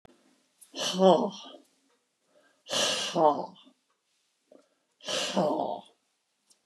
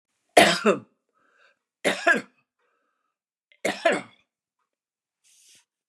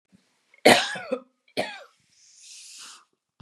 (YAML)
exhalation_length: 6.7 s
exhalation_amplitude: 14695
exhalation_signal_mean_std_ratio: 0.38
three_cough_length: 5.9 s
three_cough_amplitude: 28963
three_cough_signal_mean_std_ratio: 0.28
cough_length: 3.4 s
cough_amplitude: 29661
cough_signal_mean_std_ratio: 0.26
survey_phase: beta (2021-08-13 to 2022-03-07)
age: 65+
gender: Female
wearing_mask: 'No'
symptom_none: true
smoker_status: Never smoked
respiratory_condition_asthma: false
respiratory_condition_other: false
recruitment_source: REACT
submission_delay: 4 days
covid_test_result: Negative
covid_test_method: RT-qPCR
influenza_a_test_result: Negative
influenza_b_test_result: Negative